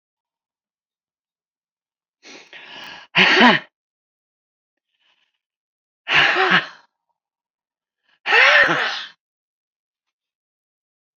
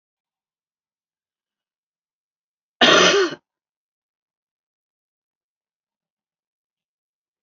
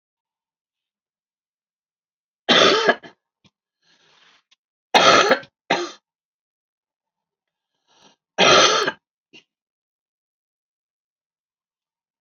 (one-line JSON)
{"exhalation_length": "11.2 s", "exhalation_amplitude": 29456, "exhalation_signal_mean_std_ratio": 0.31, "cough_length": "7.4 s", "cough_amplitude": 29747, "cough_signal_mean_std_ratio": 0.2, "three_cough_length": "12.2 s", "three_cough_amplitude": 29407, "three_cough_signal_mean_std_ratio": 0.28, "survey_phase": "beta (2021-08-13 to 2022-03-07)", "age": "65+", "gender": "Female", "wearing_mask": "Yes", "symptom_cough_any": true, "symptom_runny_or_blocked_nose": true, "symptom_sore_throat": true, "symptom_diarrhoea": true, "symptom_fatigue": true, "symptom_headache": true, "symptom_onset": "3 days", "smoker_status": "Ex-smoker", "respiratory_condition_asthma": false, "respiratory_condition_other": false, "recruitment_source": "Test and Trace", "submission_delay": "1 day", "covid_test_result": "Positive", "covid_test_method": "RT-qPCR", "covid_ct_value": 19.1, "covid_ct_gene": "ORF1ab gene", "covid_ct_mean": 19.6, "covid_viral_load": "380000 copies/ml", "covid_viral_load_category": "Low viral load (10K-1M copies/ml)"}